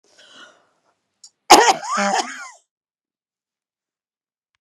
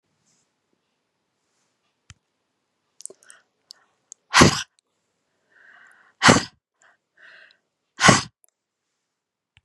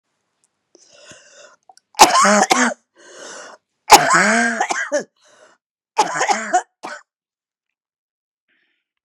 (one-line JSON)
{"cough_length": "4.6 s", "cough_amplitude": 32768, "cough_signal_mean_std_ratio": 0.26, "exhalation_length": "9.6 s", "exhalation_amplitude": 32767, "exhalation_signal_mean_std_ratio": 0.19, "three_cough_length": "9.0 s", "three_cough_amplitude": 32768, "three_cough_signal_mean_std_ratio": 0.37, "survey_phase": "beta (2021-08-13 to 2022-03-07)", "age": "65+", "gender": "Female", "wearing_mask": "No", "symptom_cough_any": true, "symptom_runny_or_blocked_nose": true, "symptom_sore_throat": true, "symptom_fatigue": true, "symptom_headache": true, "symptom_change_to_sense_of_smell_or_taste": true, "symptom_loss_of_taste": true, "symptom_onset": "5 days", "smoker_status": "Ex-smoker", "respiratory_condition_asthma": false, "respiratory_condition_other": false, "recruitment_source": "Test and Trace", "submission_delay": "2 days", "covid_test_result": "Positive", "covid_test_method": "RT-qPCR"}